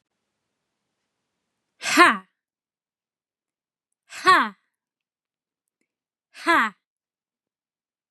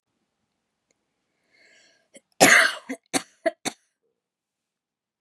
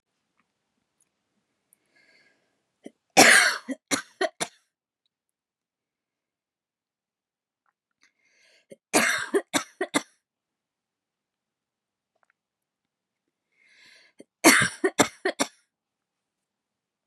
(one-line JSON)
{"exhalation_length": "8.1 s", "exhalation_amplitude": 29220, "exhalation_signal_mean_std_ratio": 0.23, "cough_length": "5.2 s", "cough_amplitude": 31806, "cough_signal_mean_std_ratio": 0.23, "three_cough_length": "17.1 s", "three_cough_amplitude": 31522, "three_cough_signal_mean_std_ratio": 0.22, "survey_phase": "beta (2021-08-13 to 2022-03-07)", "age": "18-44", "gender": "Female", "wearing_mask": "No", "symptom_runny_or_blocked_nose": true, "symptom_fatigue": true, "symptom_headache": true, "symptom_onset": "12 days", "smoker_status": "Ex-smoker", "respiratory_condition_asthma": false, "respiratory_condition_other": false, "recruitment_source": "REACT", "submission_delay": "1 day", "covid_test_result": "Negative", "covid_test_method": "RT-qPCR", "influenza_a_test_result": "Negative", "influenza_b_test_result": "Negative"}